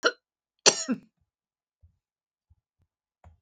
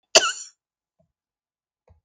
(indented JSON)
{
  "three_cough_length": "3.4 s",
  "three_cough_amplitude": 26317,
  "three_cough_signal_mean_std_ratio": 0.19,
  "cough_length": "2.0 s",
  "cough_amplitude": 32768,
  "cough_signal_mean_std_ratio": 0.19,
  "survey_phase": "beta (2021-08-13 to 2022-03-07)",
  "age": "65+",
  "gender": "Female",
  "wearing_mask": "No",
  "symptom_none": true,
  "smoker_status": "Never smoked",
  "respiratory_condition_asthma": false,
  "respiratory_condition_other": false,
  "recruitment_source": "REACT",
  "submission_delay": "2 days",
  "covid_test_result": "Negative",
  "covid_test_method": "RT-qPCR"
}